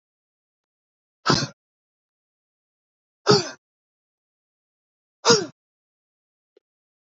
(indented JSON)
{
  "exhalation_length": "7.1 s",
  "exhalation_amplitude": 26096,
  "exhalation_signal_mean_std_ratio": 0.2,
  "survey_phase": "beta (2021-08-13 to 2022-03-07)",
  "age": "18-44",
  "gender": "Male",
  "wearing_mask": "Yes",
  "symptom_cough_any": true,
  "symptom_runny_or_blocked_nose": true,
  "smoker_status": "Never smoked",
  "respiratory_condition_asthma": false,
  "respiratory_condition_other": false,
  "recruitment_source": "Test and Trace",
  "submission_delay": "2 days",
  "covid_test_result": "Positive",
  "covid_test_method": "RT-qPCR",
  "covid_ct_value": 18.9,
  "covid_ct_gene": "ORF1ab gene",
  "covid_ct_mean": 19.4,
  "covid_viral_load": "420000 copies/ml",
  "covid_viral_load_category": "Low viral load (10K-1M copies/ml)"
}